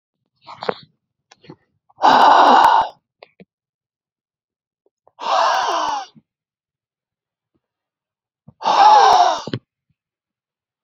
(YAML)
exhalation_length: 10.8 s
exhalation_amplitude: 30829
exhalation_signal_mean_std_ratio: 0.38
survey_phase: beta (2021-08-13 to 2022-03-07)
age: 18-44
gender: Male
wearing_mask: 'No'
symptom_runny_or_blocked_nose: true
symptom_fatigue: true
smoker_status: Ex-smoker
respiratory_condition_asthma: false
respiratory_condition_other: false
recruitment_source: REACT
submission_delay: 2 days
covid_test_result: Negative
covid_test_method: RT-qPCR